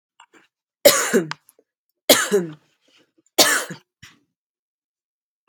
three_cough_length: 5.5 s
three_cough_amplitude: 32768
three_cough_signal_mean_std_ratio: 0.3
survey_phase: beta (2021-08-13 to 2022-03-07)
age: 18-44
gender: Female
wearing_mask: 'No'
symptom_none: true
smoker_status: Never smoked
respiratory_condition_asthma: false
respiratory_condition_other: false
recruitment_source: REACT
submission_delay: 3 days
covid_test_result: Negative
covid_test_method: RT-qPCR
influenza_a_test_result: Negative
influenza_b_test_result: Negative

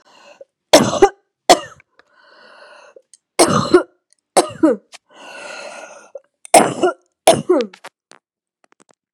three_cough_length: 9.1 s
three_cough_amplitude: 32768
three_cough_signal_mean_std_ratio: 0.33
survey_phase: beta (2021-08-13 to 2022-03-07)
age: 45-64
gender: Female
wearing_mask: 'No'
symptom_cough_any: true
symptom_runny_or_blocked_nose: true
symptom_sore_throat: true
symptom_fatigue: true
symptom_headache: true
smoker_status: Ex-smoker
respiratory_condition_asthma: false
respiratory_condition_other: false
recruitment_source: Test and Trace
submission_delay: 1 day
covid_test_result: Positive
covid_test_method: LFT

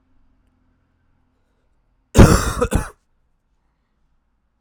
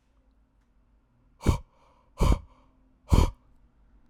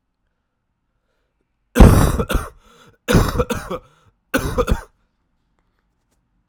cough_length: 4.6 s
cough_amplitude: 32768
cough_signal_mean_std_ratio: 0.23
exhalation_length: 4.1 s
exhalation_amplitude: 16663
exhalation_signal_mean_std_ratio: 0.28
three_cough_length: 6.5 s
three_cough_amplitude: 32768
three_cough_signal_mean_std_ratio: 0.33
survey_phase: alpha (2021-03-01 to 2021-08-12)
age: 18-44
gender: Male
wearing_mask: 'No'
symptom_cough_any: true
symptom_new_continuous_cough: true
symptom_shortness_of_breath: true
symptom_fever_high_temperature: true
symptom_onset: 6 days
smoker_status: Current smoker (1 to 10 cigarettes per day)
respiratory_condition_asthma: false
respiratory_condition_other: false
recruitment_source: Test and Trace
submission_delay: 2 days
covid_test_result: Positive
covid_test_method: RT-qPCR
covid_ct_value: 26.1
covid_ct_gene: ORF1ab gene
covid_ct_mean: 27.4
covid_viral_load: 1000 copies/ml
covid_viral_load_category: Minimal viral load (< 10K copies/ml)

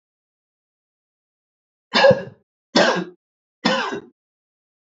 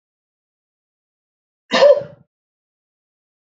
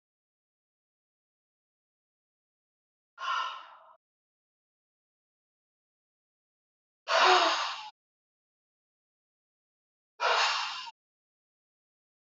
three_cough_length: 4.9 s
three_cough_amplitude: 26789
three_cough_signal_mean_std_ratio: 0.31
cough_length: 3.6 s
cough_amplitude: 27644
cough_signal_mean_std_ratio: 0.22
exhalation_length: 12.3 s
exhalation_amplitude: 9295
exhalation_signal_mean_std_ratio: 0.27
survey_phase: beta (2021-08-13 to 2022-03-07)
age: 45-64
gender: Male
wearing_mask: 'No'
symptom_runny_or_blocked_nose: true
symptom_sore_throat: true
symptom_fatigue: true
symptom_onset: 2 days
smoker_status: Never smoked
respiratory_condition_asthma: false
respiratory_condition_other: false
recruitment_source: Test and Trace
submission_delay: 1 day
covid_test_result: Positive
covid_test_method: RT-qPCR
covid_ct_value: 25.6
covid_ct_gene: ORF1ab gene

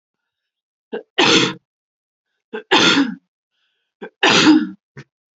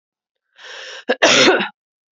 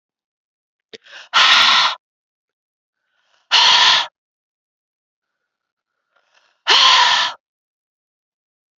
three_cough_length: 5.4 s
three_cough_amplitude: 29897
three_cough_signal_mean_std_ratio: 0.4
cough_length: 2.1 s
cough_amplitude: 32767
cough_signal_mean_std_ratio: 0.42
exhalation_length: 8.8 s
exhalation_amplitude: 32768
exhalation_signal_mean_std_ratio: 0.37
survey_phase: beta (2021-08-13 to 2022-03-07)
age: 18-44
gender: Female
wearing_mask: 'No'
symptom_runny_or_blocked_nose: true
symptom_shortness_of_breath: true
symptom_sore_throat: true
symptom_fatigue: true
symptom_change_to_sense_of_smell_or_taste: true
symptom_loss_of_taste: true
symptom_other: true
smoker_status: Never smoked
respiratory_condition_asthma: false
respiratory_condition_other: false
recruitment_source: Test and Trace
submission_delay: 10 days
covid_test_result: Negative
covid_test_method: RT-qPCR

